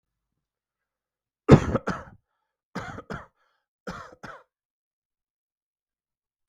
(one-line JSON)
{"three_cough_length": "6.5 s", "three_cough_amplitude": 32768, "three_cough_signal_mean_std_ratio": 0.17, "survey_phase": "beta (2021-08-13 to 2022-03-07)", "age": "45-64", "gender": "Male", "wearing_mask": "No", "symptom_diarrhoea": true, "symptom_fever_high_temperature": true, "symptom_headache": true, "symptom_onset": "3 days", "smoker_status": "Never smoked", "respiratory_condition_asthma": false, "respiratory_condition_other": false, "recruitment_source": "Test and Trace", "submission_delay": "1 day", "covid_test_result": "Positive", "covid_test_method": "RT-qPCR", "covid_ct_value": 18.9, "covid_ct_gene": "ORF1ab gene"}